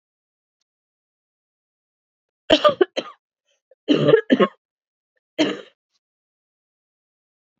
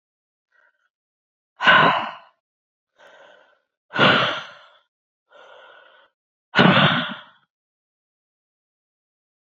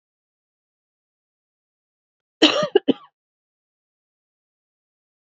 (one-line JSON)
{"three_cough_length": "7.6 s", "three_cough_amplitude": 27628, "three_cough_signal_mean_std_ratio": 0.25, "exhalation_length": "9.6 s", "exhalation_amplitude": 27482, "exhalation_signal_mean_std_ratio": 0.3, "cough_length": "5.4 s", "cough_amplitude": 30398, "cough_signal_mean_std_ratio": 0.17, "survey_phase": "beta (2021-08-13 to 2022-03-07)", "age": "45-64", "gender": "Female", "wearing_mask": "No", "symptom_cough_any": true, "symptom_runny_or_blocked_nose": true, "symptom_fatigue": true, "symptom_fever_high_temperature": true, "symptom_headache": true, "symptom_change_to_sense_of_smell_or_taste": true, "symptom_loss_of_taste": true, "symptom_onset": "4 days", "smoker_status": "Never smoked", "respiratory_condition_asthma": false, "respiratory_condition_other": false, "recruitment_source": "Test and Trace", "submission_delay": "2 days", "covid_test_result": "Positive", "covid_test_method": "ePCR"}